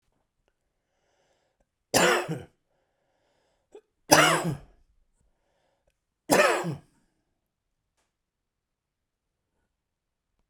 {"three_cough_length": "10.5 s", "three_cough_amplitude": 31182, "three_cough_signal_mean_std_ratio": 0.26, "survey_phase": "beta (2021-08-13 to 2022-03-07)", "age": "45-64", "gender": "Male", "wearing_mask": "No", "symptom_cough_any": true, "symptom_runny_or_blocked_nose": true, "symptom_shortness_of_breath": true, "symptom_sore_throat": true, "symptom_abdominal_pain": true, "symptom_fatigue": true, "symptom_headache": true, "symptom_other": true, "symptom_onset": "5 days", "smoker_status": "Never smoked", "respiratory_condition_asthma": false, "respiratory_condition_other": false, "recruitment_source": "Test and Trace", "submission_delay": "2 days", "covid_test_result": "Positive", "covid_test_method": "RT-qPCR", "covid_ct_value": 26.7, "covid_ct_gene": "ORF1ab gene", "covid_ct_mean": 27.7, "covid_viral_load": "830 copies/ml", "covid_viral_load_category": "Minimal viral load (< 10K copies/ml)"}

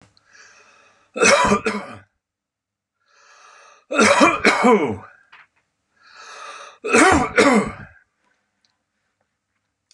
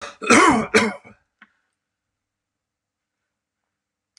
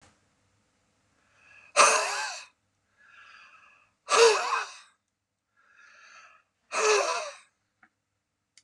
{"three_cough_length": "9.9 s", "three_cough_amplitude": 31002, "three_cough_signal_mean_std_ratio": 0.4, "cough_length": "4.2 s", "cough_amplitude": 30716, "cough_signal_mean_std_ratio": 0.3, "exhalation_length": "8.6 s", "exhalation_amplitude": 17729, "exhalation_signal_mean_std_ratio": 0.33, "survey_phase": "beta (2021-08-13 to 2022-03-07)", "age": "65+", "gender": "Male", "wearing_mask": "No", "symptom_none": true, "smoker_status": "Ex-smoker", "respiratory_condition_asthma": false, "respiratory_condition_other": false, "recruitment_source": "REACT", "submission_delay": "1 day", "covid_test_result": "Negative", "covid_test_method": "RT-qPCR", "covid_ct_value": 44.0, "covid_ct_gene": "N gene"}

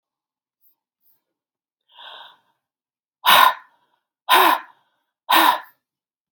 {"exhalation_length": "6.3 s", "exhalation_amplitude": 32767, "exhalation_signal_mean_std_ratio": 0.3, "survey_phase": "beta (2021-08-13 to 2022-03-07)", "age": "65+", "gender": "Female", "wearing_mask": "No", "symptom_cough_any": true, "symptom_runny_or_blocked_nose": true, "smoker_status": "Never smoked", "respiratory_condition_asthma": false, "respiratory_condition_other": false, "recruitment_source": "Test and Trace", "submission_delay": "3 days", "covid_test_result": "Positive", "covid_test_method": "LFT"}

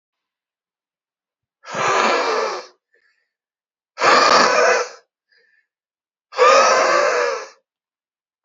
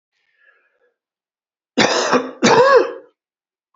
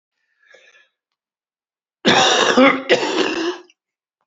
{"exhalation_length": "8.4 s", "exhalation_amplitude": 31334, "exhalation_signal_mean_std_ratio": 0.47, "three_cough_length": "3.8 s", "three_cough_amplitude": 31700, "three_cough_signal_mean_std_ratio": 0.41, "cough_length": "4.3 s", "cough_amplitude": 29346, "cough_signal_mean_std_ratio": 0.45, "survey_phase": "beta (2021-08-13 to 2022-03-07)", "age": "45-64", "gender": "Male", "wearing_mask": "No", "symptom_cough_any": true, "symptom_new_continuous_cough": true, "symptom_runny_or_blocked_nose": true, "symptom_shortness_of_breath": true, "symptom_sore_throat": true, "symptom_fatigue": true, "symptom_fever_high_temperature": true, "symptom_headache": true, "symptom_onset": "4 days", "smoker_status": "Ex-smoker", "respiratory_condition_asthma": true, "respiratory_condition_other": false, "recruitment_source": "Test and Trace", "submission_delay": "2 days", "covid_test_result": "Positive", "covid_test_method": "RT-qPCR"}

